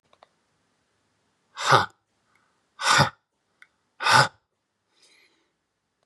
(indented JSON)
{
  "exhalation_length": "6.1 s",
  "exhalation_amplitude": 27111,
  "exhalation_signal_mean_std_ratio": 0.27,
  "survey_phase": "beta (2021-08-13 to 2022-03-07)",
  "age": "18-44",
  "gender": "Male",
  "wearing_mask": "No",
  "symptom_none": true,
  "symptom_onset": "12 days",
  "smoker_status": "Never smoked",
  "respiratory_condition_asthma": false,
  "respiratory_condition_other": true,
  "recruitment_source": "REACT",
  "submission_delay": "1 day",
  "covid_test_result": "Negative",
  "covid_test_method": "RT-qPCR"
}